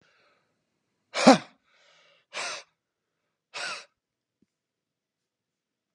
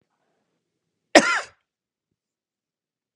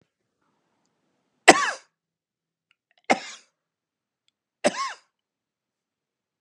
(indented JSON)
{
  "exhalation_length": "5.9 s",
  "exhalation_amplitude": 28609,
  "exhalation_signal_mean_std_ratio": 0.17,
  "cough_length": "3.2 s",
  "cough_amplitude": 32768,
  "cough_signal_mean_std_ratio": 0.18,
  "three_cough_length": "6.4 s",
  "three_cough_amplitude": 32768,
  "three_cough_signal_mean_std_ratio": 0.17,
  "survey_phase": "beta (2021-08-13 to 2022-03-07)",
  "age": "45-64",
  "gender": "Male",
  "wearing_mask": "No",
  "symptom_none": true,
  "smoker_status": "Never smoked",
  "respiratory_condition_asthma": false,
  "respiratory_condition_other": false,
  "recruitment_source": "REACT",
  "submission_delay": "2 days",
  "covid_test_result": "Negative",
  "covid_test_method": "RT-qPCR",
  "influenza_a_test_result": "Negative",
  "influenza_b_test_result": "Negative"
}